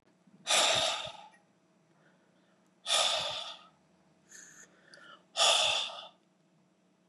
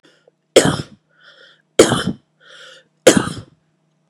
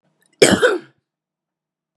{"exhalation_length": "7.1 s", "exhalation_amplitude": 7240, "exhalation_signal_mean_std_ratio": 0.42, "three_cough_length": "4.1 s", "three_cough_amplitude": 32768, "three_cough_signal_mean_std_ratio": 0.3, "cough_length": "2.0 s", "cough_amplitude": 32768, "cough_signal_mean_std_ratio": 0.31, "survey_phase": "beta (2021-08-13 to 2022-03-07)", "age": "18-44", "gender": "Female", "wearing_mask": "No", "symptom_cough_any": true, "symptom_sore_throat": true, "symptom_abdominal_pain": true, "symptom_fatigue": true, "symptom_headache": true, "symptom_change_to_sense_of_smell_or_taste": true, "symptom_other": true, "smoker_status": "Never smoked", "respiratory_condition_asthma": false, "respiratory_condition_other": false, "recruitment_source": "Test and Trace", "submission_delay": "1 day", "covid_test_result": "Positive", "covid_test_method": "RT-qPCR", "covid_ct_value": 25.9, "covid_ct_gene": "N gene"}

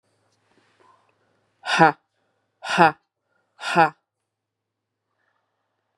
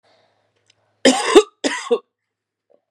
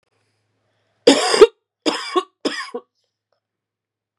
{"exhalation_length": "6.0 s", "exhalation_amplitude": 32583, "exhalation_signal_mean_std_ratio": 0.23, "cough_length": "2.9 s", "cough_amplitude": 32768, "cough_signal_mean_std_ratio": 0.31, "three_cough_length": "4.2 s", "three_cough_amplitude": 32768, "three_cough_signal_mean_std_ratio": 0.28, "survey_phase": "beta (2021-08-13 to 2022-03-07)", "age": "18-44", "gender": "Female", "wearing_mask": "No", "symptom_cough_any": true, "symptom_runny_or_blocked_nose": true, "symptom_sore_throat": true, "symptom_fatigue": true, "symptom_headache": true, "symptom_change_to_sense_of_smell_or_taste": true, "symptom_onset": "2 days", "smoker_status": "Current smoker (e-cigarettes or vapes only)", "respiratory_condition_asthma": false, "respiratory_condition_other": false, "recruitment_source": "Test and Trace", "submission_delay": "2 days", "covid_test_result": "Positive", "covid_test_method": "RT-qPCR", "covid_ct_value": 12.2, "covid_ct_gene": "ORF1ab gene", "covid_ct_mean": 12.7, "covid_viral_load": "66000000 copies/ml", "covid_viral_load_category": "High viral load (>1M copies/ml)"}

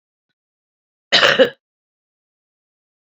{"cough_length": "3.1 s", "cough_amplitude": 32768, "cough_signal_mean_std_ratio": 0.25, "survey_phase": "beta (2021-08-13 to 2022-03-07)", "age": "45-64", "gender": "Female", "wearing_mask": "No", "symptom_cough_any": true, "symptom_runny_or_blocked_nose": true, "symptom_shortness_of_breath": true, "symptom_diarrhoea": true, "symptom_headache": true, "symptom_onset": "3 days", "smoker_status": "Current smoker (1 to 10 cigarettes per day)", "respiratory_condition_asthma": false, "respiratory_condition_other": false, "recruitment_source": "Test and Trace", "submission_delay": "2 days", "covid_test_result": "Positive", "covid_test_method": "RT-qPCR"}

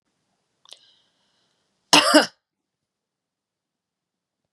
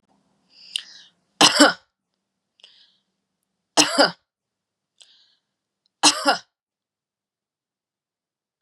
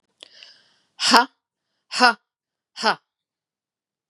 {"cough_length": "4.5 s", "cough_amplitude": 32768, "cough_signal_mean_std_ratio": 0.19, "three_cough_length": "8.6 s", "three_cough_amplitude": 32767, "three_cough_signal_mean_std_ratio": 0.23, "exhalation_length": "4.1 s", "exhalation_amplitude": 32768, "exhalation_signal_mean_std_ratio": 0.26, "survey_phase": "beta (2021-08-13 to 2022-03-07)", "age": "45-64", "gender": "Female", "wearing_mask": "No", "symptom_cough_any": true, "symptom_runny_or_blocked_nose": true, "symptom_onset": "2 days", "smoker_status": "Never smoked", "respiratory_condition_asthma": false, "respiratory_condition_other": false, "recruitment_source": "Test and Trace", "submission_delay": "1 day", "covid_test_result": "Positive", "covid_test_method": "ePCR"}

